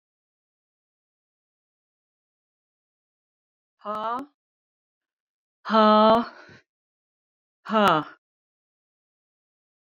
{
  "exhalation_length": "10.0 s",
  "exhalation_amplitude": 16772,
  "exhalation_signal_mean_std_ratio": 0.25,
  "survey_phase": "beta (2021-08-13 to 2022-03-07)",
  "age": "45-64",
  "gender": "Female",
  "wearing_mask": "No",
  "symptom_new_continuous_cough": true,
  "symptom_other": true,
  "smoker_status": "Ex-smoker",
  "respiratory_condition_asthma": false,
  "respiratory_condition_other": false,
  "recruitment_source": "Test and Trace",
  "submission_delay": "2 days",
  "covid_test_result": "Positive",
  "covid_test_method": "RT-qPCR",
  "covid_ct_value": 29.8,
  "covid_ct_gene": "ORF1ab gene"
}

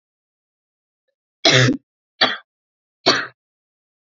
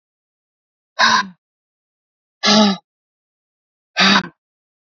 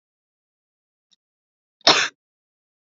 {
  "three_cough_length": "4.1 s",
  "three_cough_amplitude": 32767,
  "three_cough_signal_mean_std_ratio": 0.3,
  "exhalation_length": "4.9 s",
  "exhalation_amplitude": 29378,
  "exhalation_signal_mean_std_ratio": 0.34,
  "cough_length": "2.9 s",
  "cough_amplitude": 30367,
  "cough_signal_mean_std_ratio": 0.19,
  "survey_phase": "beta (2021-08-13 to 2022-03-07)",
  "age": "18-44",
  "gender": "Female",
  "wearing_mask": "No",
  "symptom_cough_any": true,
  "symptom_change_to_sense_of_smell_or_taste": true,
  "symptom_onset": "13 days",
  "smoker_status": "Never smoked",
  "respiratory_condition_asthma": false,
  "respiratory_condition_other": false,
  "recruitment_source": "REACT",
  "submission_delay": "2 days",
  "covid_test_result": "Negative",
  "covid_test_method": "RT-qPCR"
}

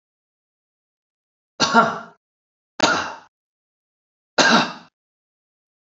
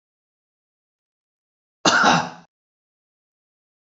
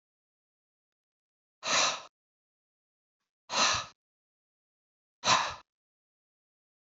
{
  "three_cough_length": "5.9 s",
  "three_cough_amplitude": 30053,
  "three_cough_signal_mean_std_ratio": 0.3,
  "cough_length": "3.8 s",
  "cough_amplitude": 26213,
  "cough_signal_mean_std_ratio": 0.26,
  "exhalation_length": "6.9 s",
  "exhalation_amplitude": 9803,
  "exhalation_signal_mean_std_ratio": 0.28,
  "survey_phase": "beta (2021-08-13 to 2022-03-07)",
  "age": "65+",
  "gender": "Male",
  "wearing_mask": "No",
  "symptom_none": true,
  "smoker_status": "Never smoked",
  "respiratory_condition_asthma": false,
  "respiratory_condition_other": false,
  "recruitment_source": "REACT",
  "submission_delay": "2 days",
  "covid_test_result": "Negative",
  "covid_test_method": "RT-qPCR",
  "influenza_a_test_result": "Negative",
  "influenza_b_test_result": "Negative"
}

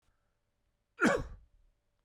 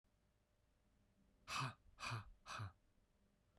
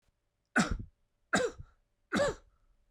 {
  "cough_length": "2.0 s",
  "cough_amplitude": 6112,
  "cough_signal_mean_std_ratio": 0.28,
  "exhalation_length": "3.6 s",
  "exhalation_amplitude": 750,
  "exhalation_signal_mean_std_ratio": 0.42,
  "three_cough_length": "2.9 s",
  "three_cough_amplitude": 6707,
  "three_cough_signal_mean_std_ratio": 0.39,
  "survey_phase": "beta (2021-08-13 to 2022-03-07)",
  "age": "45-64",
  "gender": "Male",
  "wearing_mask": "No",
  "symptom_cough_any": true,
  "symptom_runny_or_blocked_nose": true,
  "symptom_fatigue": true,
  "symptom_headache": true,
  "symptom_change_to_sense_of_smell_or_taste": true,
  "symptom_other": true,
  "symptom_onset": "4 days",
  "smoker_status": "Never smoked",
  "respiratory_condition_asthma": false,
  "respiratory_condition_other": false,
  "recruitment_source": "Test and Trace",
  "submission_delay": "2 days",
  "covid_test_result": "Positive",
  "covid_test_method": "RT-qPCR"
}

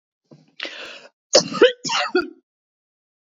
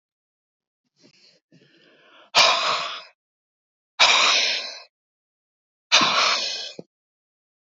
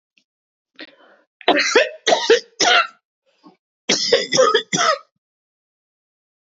{
  "cough_length": "3.2 s",
  "cough_amplitude": 29665,
  "cough_signal_mean_std_ratio": 0.33,
  "exhalation_length": "7.8 s",
  "exhalation_amplitude": 25678,
  "exhalation_signal_mean_std_ratio": 0.39,
  "three_cough_length": "6.5 s",
  "three_cough_amplitude": 32767,
  "three_cough_signal_mean_std_ratio": 0.42,
  "survey_phase": "beta (2021-08-13 to 2022-03-07)",
  "age": "45-64",
  "gender": "Female",
  "wearing_mask": "No",
  "symptom_none": true,
  "smoker_status": "Never smoked",
  "respiratory_condition_asthma": true,
  "respiratory_condition_other": false,
  "recruitment_source": "REACT",
  "submission_delay": "1 day",
  "covid_test_result": "Negative",
  "covid_test_method": "RT-qPCR",
  "influenza_a_test_result": "Negative",
  "influenza_b_test_result": "Negative"
}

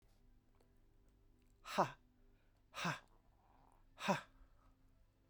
{
  "exhalation_length": "5.3 s",
  "exhalation_amplitude": 3055,
  "exhalation_signal_mean_std_ratio": 0.29,
  "survey_phase": "beta (2021-08-13 to 2022-03-07)",
  "age": "45-64",
  "gender": "Female",
  "wearing_mask": "No",
  "symptom_cough_any": true,
  "symptom_runny_or_blocked_nose": true,
  "symptom_change_to_sense_of_smell_or_taste": true,
  "smoker_status": "Never smoked",
  "respiratory_condition_asthma": true,
  "respiratory_condition_other": false,
  "recruitment_source": "Test and Trace",
  "submission_delay": "2 days",
  "covid_test_result": "Positive",
  "covid_test_method": "RT-qPCR",
  "covid_ct_value": 27.5,
  "covid_ct_gene": "ORF1ab gene",
  "covid_ct_mean": 28.1,
  "covid_viral_load": "590 copies/ml",
  "covid_viral_load_category": "Minimal viral load (< 10K copies/ml)"
}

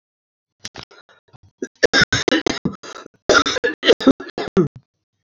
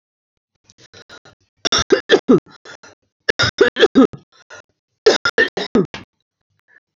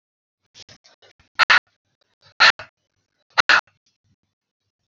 {
  "cough_length": "5.3 s",
  "cough_amplitude": 30405,
  "cough_signal_mean_std_ratio": 0.36,
  "three_cough_length": "7.0 s",
  "three_cough_amplitude": 31713,
  "three_cough_signal_mean_std_ratio": 0.33,
  "exhalation_length": "4.9 s",
  "exhalation_amplitude": 29503,
  "exhalation_signal_mean_std_ratio": 0.22,
  "survey_phase": "alpha (2021-03-01 to 2021-08-12)",
  "age": "45-64",
  "gender": "Female",
  "wearing_mask": "No",
  "symptom_abdominal_pain": true,
  "symptom_diarrhoea": true,
  "symptom_fatigue": true,
  "symptom_loss_of_taste": true,
  "symptom_onset": "4 days",
  "smoker_status": "Current smoker (1 to 10 cigarettes per day)",
  "respiratory_condition_asthma": false,
  "respiratory_condition_other": false,
  "recruitment_source": "Test and Trace",
  "submission_delay": "2 days",
  "covid_test_result": "Positive",
  "covid_test_method": "RT-qPCR",
  "covid_ct_value": 25.1,
  "covid_ct_gene": "E gene"
}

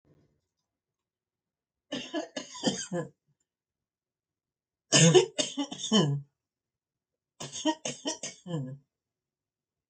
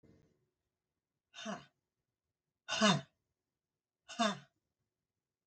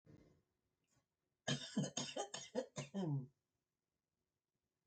{
  "three_cough_length": "9.9 s",
  "three_cough_amplitude": 13731,
  "three_cough_signal_mean_std_ratio": 0.32,
  "exhalation_length": "5.5 s",
  "exhalation_amplitude": 5090,
  "exhalation_signal_mean_std_ratio": 0.25,
  "cough_length": "4.9 s",
  "cough_amplitude": 1505,
  "cough_signal_mean_std_ratio": 0.41,
  "survey_phase": "alpha (2021-03-01 to 2021-08-12)",
  "age": "65+",
  "gender": "Female",
  "wearing_mask": "No",
  "symptom_none": true,
  "smoker_status": "Ex-smoker",
  "respiratory_condition_asthma": false,
  "respiratory_condition_other": false,
  "recruitment_source": "REACT",
  "submission_delay": "1 day",
  "covid_test_result": "Negative",
  "covid_test_method": "RT-qPCR"
}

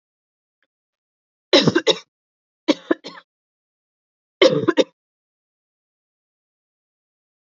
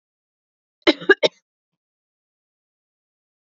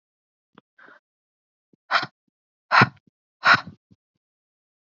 {
  "three_cough_length": "7.4 s",
  "three_cough_amplitude": 29652,
  "three_cough_signal_mean_std_ratio": 0.23,
  "cough_length": "3.5 s",
  "cough_amplitude": 28682,
  "cough_signal_mean_std_ratio": 0.16,
  "exhalation_length": "4.9 s",
  "exhalation_amplitude": 26499,
  "exhalation_signal_mean_std_ratio": 0.22,
  "survey_phase": "beta (2021-08-13 to 2022-03-07)",
  "age": "18-44",
  "gender": "Female",
  "wearing_mask": "No",
  "symptom_cough_any": true,
  "symptom_runny_or_blocked_nose": true,
  "symptom_sore_throat": true,
  "symptom_other": true,
  "symptom_onset": "3 days",
  "smoker_status": "Never smoked",
  "respiratory_condition_asthma": false,
  "respiratory_condition_other": false,
  "recruitment_source": "Test and Trace",
  "submission_delay": "2 days",
  "covid_test_result": "Positive",
  "covid_test_method": "ePCR"
}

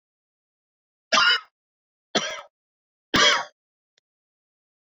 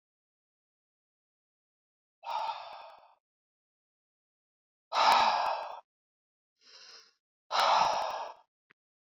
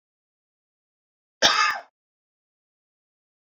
{
  "three_cough_length": "4.9 s",
  "three_cough_amplitude": 18430,
  "three_cough_signal_mean_std_ratio": 0.3,
  "exhalation_length": "9.0 s",
  "exhalation_amplitude": 9021,
  "exhalation_signal_mean_std_ratio": 0.35,
  "cough_length": "3.5 s",
  "cough_amplitude": 20602,
  "cough_signal_mean_std_ratio": 0.24,
  "survey_phase": "beta (2021-08-13 to 2022-03-07)",
  "age": "45-64",
  "gender": "Male",
  "wearing_mask": "No",
  "symptom_none": true,
  "smoker_status": "Ex-smoker",
  "respiratory_condition_asthma": false,
  "respiratory_condition_other": false,
  "recruitment_source": "REACT",
  "submission_delay": "3 days",
  "covid_test_result": "Negative",
  "covid_test_method": "RT-qPCR"
}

